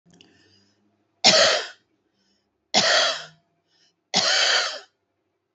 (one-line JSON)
{"three_cough_length": "5.5 s", "three_cough_amplitude": 27370, "three_cough_signal_mean_std_ratio": 0.41, "survey_phase": "beta (2021-08-13 to 2022-03-07)", "age": "45-64", "gender": "Female", "wearing_mask": "No", "symptom_cough_any": true, "symptom_onset": "5 days", "smoker_status": "Current smoker (1 to 10 cigarettes per day)", "respiratory_condition_asthma": false, "respiratory_condition_other": false, "recruitment_source": "REACT", "submission_delay": "3 days", "covid_test_result": "Negative", "covid_test_method": "RT-qPCR"}